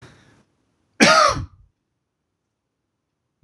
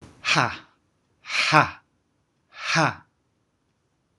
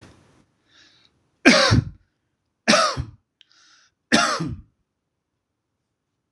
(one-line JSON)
{"cough_length": "3.4 s", "cough_amplitude": 26028, "cough_signal_mean_std_ratio": 0.27, "exhalation_length": "4.2 s", "exhalation_amplitude": 26027, "exhalation_signal_mean_std_ratio": 0.35, "three_cough_length": "6.3 s", "three_cough_amplitude": 26028, "three_cough_signal_mean_std_ratio": 0.32, "survey_phase": "beta (2021-08-13 to 2022-03-07)", "age": "45-64", "gender": "Male", "wearing_mask": "No", "symptom_none": true, "smoker_status": "Never smoked", "respiratory_condition_asthma": false, "respiratory_condition_other": false, "recruitment_source": "REACT", "submission_delay": "2 days", "covid_test_result": "Negative", "covid_test_method": "RT-qPCR", "influenza_a_test_result": "Unknown/Void", "influenza_b_test_result": "Unknown/Void"}